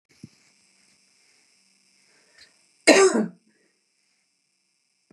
{"cough_length": "5.1 s", "cough_amplitude": 27964, "cough_signal_mean_std_ratio": 0.22, "survey_phase": "beta (2021-08-13 to 2022-03-07)", "age": "65+", "gender": "Female", "wearing_mask": "No", "symptom_none": true, "smoker_status": "Never smoked", "respiratory_condition_asthma": false, "respiratory_condition_other": false, "recruitment_source": "REACT", "submission_delay": "3 days", "covid_test_result": "Negative", "covid_test_method": "RT-qPCR", "influenza_a_test_result": "Negative", "influenza_b_test_result": "Negative"}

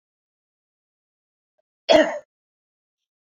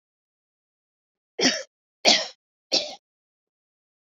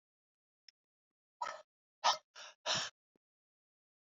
{"cough_length": "3.2 s", "cough_amplitude": 23832, "cough_signal_mean_std_ratio": 0.2, "three_cough_length": "4.1 s", "three_cough_amplitude": 24053, "three_cough_signal_mean_std_ratio": 0.27, "exhalation_length": "4.1 s", "exhalation_amplitude": 4409, "exhalation_signal_mean_std_ratio": 0.25, "survey_phase": "beta (2021-08-13 to 2022-03-07)", "age": "45-64", "gender": "Female", "wearing_mask": "No", "symptom_none": true, "smoker_status": "Ex-smoker", "respiratory_condition_asthma": false, "respiratory_condition_other": false, "recruitment_source": "REACT", "submission_delay": "1 day", "covid_test_result": "Negative", "covid_test_method": "RT-qPCR"}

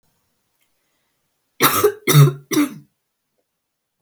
{"three_cough_length": "4.0 s", "three_cough_amplitude": 32768, "three_cough_signal_mean_std_ratio": 0.33, "survey_phase": "beta (2021-08-13 to 2022-03-07)", "age": "18-44", "gender": "Female", "wearing_mask": "No", "symptom_fatigue": true, "symptom_onset": "13 days", "smoker_status": "Never smoked", "respiratory_condition_asthma": false, "respiratory_condition_other": false, "recruitment_source": "REACT", "submission_delay": "0 days", "covid_test_result": "Negative", "covid_test_method": "RT-qPCR", "influenza_a_test_result": "Negative", "influenza_b_test_result": "Negative"}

